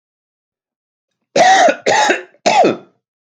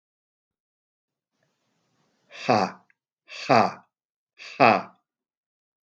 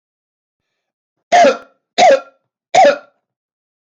cough_length: 3.2 s
cough_amplitude: 29459
cough_signal_mean_std_ratio: 0.49
exhalation_length: 5.9 s
exhalation_amplitude: 25439
exhalation_signal_mean_std_ratio: 0.25
three_cough_length: 3.9 s
three_cough_amplitude: 29210
three_cough_signal_mean_std_ratio: 0.37
survey_phase: beta (2021-08-13 to 2022-03-07)
age: 45-64
gender: Male
wearing_mask: 'No'
symptom_headache: true
symptom_onset: 12 days
smoker_status: Never smoked
respiratory_condition_asthma: false
respiratory_condition_other: false
recruitment_source: REACT
submission_delay: 1 day
covid_test_result: Negative
covid_test_method: RT-qPCR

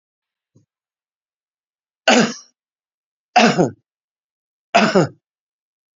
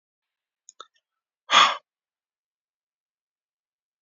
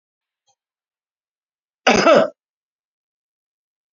three_cough_length: 6.0 s
three_cough_amplitude: 31290
three_cough_signal_mean_std_ratio: 0.29
exhalation_length: 4.0 s
exhalation_amplitude: 23731
exhalation_signal_mean_std_ratio: 0.18
cough_length: 3.9 s
cough_amplitude: 28564
cough_signal_mean_std_ratio: 0.25
survey_phase: beta (2021-08-13 to 2022-03-07)
age: 65+
gender: Male
wearing_mask: 'No'
symptom_none: true
smoker_status: Ex-smoker
respiratory_condition_asthma: false
respiratory_condition_other: false
recruitment_source: REACT
submission_delay: 8 days
covid_test_result: Negative
covid_test_method: RT-qPCR
influenza_a_test_result: Negative
influenza_b_test_result: Negative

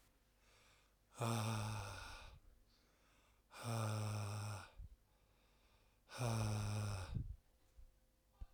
exhalation_length: 8.5 s
exhalation_amplitude: 1255
exhalation_signal_mean_std_ratio: 0.6
survey_phase: alpha (2021-03-01 to 2021-08-12)
age: 45-64
gender: Male
wearing_mask: 'No'
symptom_none: true
smoker_status: Ex-smoker
respiratory_condition_asthma: false
respiratory_condition_other: false
recruitment_source: REACT
submission_delay: 3 days
covid_test_result: Negative
covid_test_method: RT-qPCR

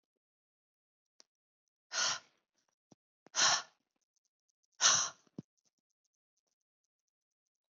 exhalation_length: 7.8 s
exhalation_amplitude: 8281
exhalation_signal_mean_std_ratio: 0.24
survey_phase: beta (2021-08-13 to 2022-03-07)
age: 18-44
gender: Female
wearing_mask: 'No'
symptom_none: true
smoker_status: Never smoked
respiratory_condition_asthma: false
respiratory_condition_other: false
recruitment_source: REACT
submission_delay: 1 day
covid_test_result: Negative
covid_test_method: RT-qPCR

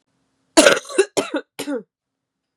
cough_length: 2.6 s
cough_amplitude: 32768
cough_signal_mean_std_ratio: 0.34
survey_phase: beta (2021-08-13 to 2022-03-07)
age: 18-44
gender: Female
wearing_mask: 'No'
symptom_cough_any: true
symptom_runny_or_blocked_nose: true
symptom_fatigue: true
symptom_fever_high_temperature: true
symptom_headache: true
symptom_onset: 2 days
smoker_status: Never smoked
respiratory_condition_asthma: false
respiratory_condition_other: false
recruitment_source: Test and Trace
submission_delay: 2 days
covid_test_result: Positive
covid_test_method: RT-qPCR
covid_ct_value: 21.7
covid_ct_gene: ORF1ab gene
covid_ct_mean: 21.9
covid_viral_load: 65000 copies/ml
covid_viral_load_category: Low viral load (10K-1M copies/ml)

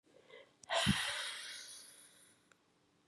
exhalation_length: 3.1 s
exhalation_amplitude: 3796
exhalation_signal_mean_std_ratio: 0.44
survey_phase: beta (2021-08-13 to 2022-03-07)
age: 45-64
gender: Female
wearing_mask: 'No'
symptom_cough_any: true
symptom_runny_or_blocked_nose: true
symptom_sore_throat: true
symptom_headache: true
symptom_change_to_sense_of_smell_or_taste: true
symptom_loss_of_taste: true
symptom_onset: 4 days
smoker_status: Never smoked
respiratory_condition_asthma: false
respiratory_condition_other: false
recruitment_source: Test and Trace
submission_delay: 1 day
covid_test_result: Positive
covid_test_method: RT-qPCR
covid_ct_value: 20.1
covid_ct_gene: ORF1ab gene
covid_ct_mean: 20.5
covid_viral_load: 180000 copies/ml
covid_viral_load_category: Low viral load (10K-1M copies/ml)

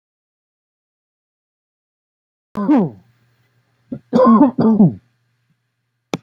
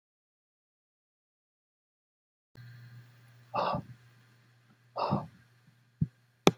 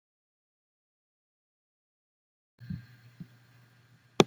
three_cough_length: 6.2 s
three_cough_amplitude: 27197
three_cough_signal_mean_std_ratio: 0.34
exhalation_length: 6.6 s
exhalation_amplitude: 26444
exhalation_signal_mean_std_ratio: 0.23
cough_length: 4.3 s
cough_amplitude: 32767
cough_signal_mean_std_ratio: 0.1
survey_phase: beta (2021-08-13 to 2022-03-07)
age: 45-64
gender: Male
wearing_mask: 'No'
symptom_none: true
smoker_status: Ex-smoker
respiratory_condition_asthma: false
respiratory_condition_other: false
recruitment_source: REACT
submission_delay: 1 day
covid_test_result: Negative
covid_test_method: RT-qPCR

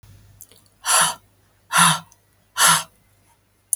exhalation_length: 3.8 s
exhalation_amplitude: 32140
exhalation_signal_mean_std_ratio: 0.37
survey_phase: beta (2021-08-13 to 2022-03-07)
age: 18-44
gender: Female
wearing_mask: 'No'
symptom_none: true
smoker_status: Never smoked
respiratory_condition_asthma: false
respiratory_condition_other: false
recruitment_source: REACT
submission_delay: 5 days
covid_test_result: Negative
covid_test_method: RT-qPCR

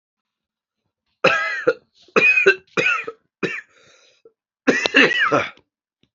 three_cough_length: 6.1 s
three_cough_amplitude: 32767
three_cough_signal_mean_std_ratio: 0.44
survey_phase: beta (2021-08-13 to 2022-03-07)
age: 45-64
gender: Male
wearing_mask: 'No'
symptom_cough_any: true
symptom_sore_throat: true
symptom_fever_high_temperature: true
symptom_headache: true
symptom_change_to_sense_of_smell_or_taste: true
smoker_status: Ex-smoker
respiratory_condition_asthma: true
respiratory_condition_other: false
recruitment_source: Test and Trace
submission_delay: 2 days
covid_test_result: Positive
covid_test_method: RT-qPCR
covid_ct_value: 16.8
covid_ct_gene: ORF1ab gene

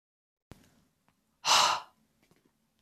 exhalation_length: 2.8 s
exhalation_amplitude: 10632
exhalation_signal_mean_std_ratio: 0.28
survey_phase: beta (2021-08-13 to 2022-03-07)
age: 18-44
gender: Female
wearing_mask: 'No'
symptom_sore_throat: true
symptom_fatigue: true
symptom_onset: 2 days
smoker_status: Ex-smoker
respiratory_condition_asthma: false
respiratory_condition_other: false
recruitment_source: Test and Trace
submission_delay: 1 day
covid_test_result: Positive
covid_test_method: RT-qPCR
covid_ct_value: 22.0
covid_ct_gene: ORF1ab gene
covid_ct_mean: 22.7
covid_viral_load: 37000 copies/ml
covid_viral_load_category: Low viral load (10K-1M copies/ml)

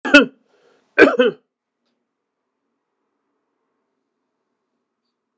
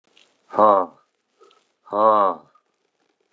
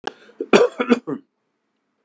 three_cough_length: 5.4 s
three_cough_amplitude: 32768
three_cough_signal_mean_std_ratio: 0.21
exhalation_length: 3.3 s
exhalation_amplitude: 28992
exhalation_signal_mean_std_ratio: 0.35
cough_length: 2.0 s
cough_amplitude: 32768
cough_signal_mean_std_ratio: 0.33
survey_phase: beta (2021-08-13 to 2022-03-07)
age: 65+
gender: Male
wearing_mask: 'No'
symptom_sore_throat: true
symptom_diarrhoea: true
symptom_fatigue: true
smoker_status: Never smoked
respiratory_condition_asthma: false
respiratory_condition_other: false
recruitment_source: Test and Trace
submission_delay: 1 day
covid_test_result: Positive
covid_test_method: RT-qPCR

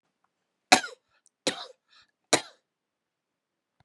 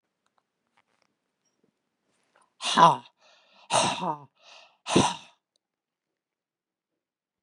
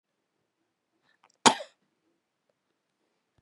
three_cough_length: 3.8 s
three_cough_amplitude: 32767
three_cough_signal_mean_std_ratio: 0.17
exhalation_length: 7.4 s
exhalation_amplitude: 22544
exhalation_signal_mean_std_ratio: 0.25
cough_length: 3.4 s
cough_amplitude: 27068
cough_signal_mean_std_ratio: 0.12
survey_phase: beta (2021-08-13 to 2022-03-07)
age: 65+
gender: Female
wearing_mask: 'No'
symptom_cough_any: true
symptom_runny_or_blocked_nose: true
symptom_fatigue: true
symptom_onset: 4 days
smoker_status: Never smoked
respiratory_condition_asthma: false
respiratory_condition_other: false
recruitment_source: Test and Trace
submission_delay: 1 day
covid_test_result: Positive
covid_test_method: RT-qPCR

